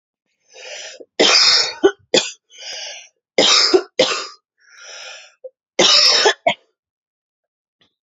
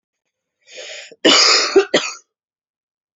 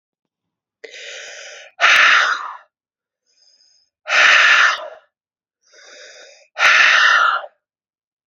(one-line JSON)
{"three_cough_length": "8.0 s", "three_cough_amplitude": 32354, "three_cough_signal_mean_std_ratio": 0.44, "cough_length": "3.2 s", "cough_amplitude": 31402, "cough_signal_mean_std_ratio": 0.4, "exhalation_length": "8.3 s", "exhalation_amplitude": 30166, "exhalation_signal_mean_std_ratio": 0.45, "survey_phase": "beta (2021-08-13 to 2022-03-07)", "age": "18-44", "gender": "Female", "wearing_mask": "No", "symptom_cough_any": true, "symptom_runny_or_blocked_nose": true, "symptom_sore_throat": true, "symptom_fatigue": true, "smoker_status": "Ex-smoker", "respiratory_condition_asthma": false, "respiratory_condition_other": false, "recruitment_source": "Test and Trace", "submission_delay": "3 days", "covid_test_result": "Positive", "covid_test_method": "RT-qPCR", "covid_ct_value": 25.5, "covid_ct_gene": "ORF1ab gene", "covid_ct_mean": 25.9, "covid_viral_load": "3300 copies/ml", "covid_viral_load_category": "Minimal viral load (< 10K copies/ml)"}